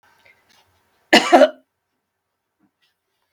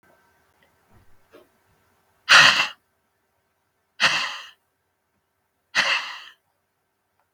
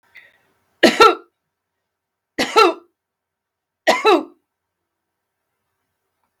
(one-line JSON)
{"cough_length": "3.3 s", "cough_amplitude": 32768, "cough_signal_mean_std_ratio": 0.23, "exhalation_length": "7.3 s", "exhalation_amplitude": 32768, "exhalation_signal_mean_std_ratio": 0.26, "three_cough_length": "6.4 s", "three_cough_amplitude": 32768, "three_cough_signal_mean_std_ratio": 0.28, "survey_phase": "beta (2021-08-13 to 2022-03-07)", "age": "45-64", "gender": "Female", "wearing_mask": "No", "symptom_fatigue": true, "smoker_status": "Never smoked", "respiratory_condition_asthma": false, "respiratory_condition_other": false, "recruitment_source": "REACT", "submission_delay": "3 days", "covid_test_result": "Negative", "covid_test_method": "RT-qPCR", "influenza_a_test_result": "Negative", "influenza_b_test_result": "Negative"}